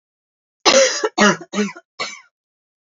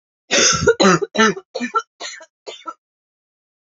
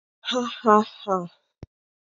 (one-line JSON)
{"three_cough_length": "2.9 s", "three_cough_amplitude": 32768, "three_cough_signal_mean_std_ratio": 0.41, "cough_length": "3.7 s", "cough_amplitude": 29354, "cough_signal_mean_std_ratio": 0.43, "exhalation_length": "2.1 s", "exhalation_amplitude": 24954, "exhalation_signal_mean_std_ratio": 0.36, "survey_phase": "alpha (2021-03-01 to 2021-08-12)", "age": "18-44", "gender": "Female", "wearing_mask": "No", "symptom_cough_any": true, "symptom_new_continuous_cough": true, "symptom_shortness_of_breath": true, "symptom_abdominal_pain": true, "symptom_fatigue": true, "symptom_fever_high_temperature": true, "symptom_headache": true, "symptom_change_to_sense_of_smell_or_taste": true, "symptom_loss_of_taste": true, "symptom_onset": "4 days", "smoker_status": "Never smoked", "respiratory_condition_asthma": false, "respiratory_condition_other": false, "recruitment_source": "Test and Trace", "submission_delay": "2 days", "covid_test_result": "Positive", "covid_test_method": "RT-qPCR", "covid_ct_value": 16.2, "covid_ct_gene": "N gene", "covid_ct_mean": 16.8, "covid_viral_load": "3100000 copies/ml", "covid_viral_load_category": "High viral load (>1M copies/ml)"}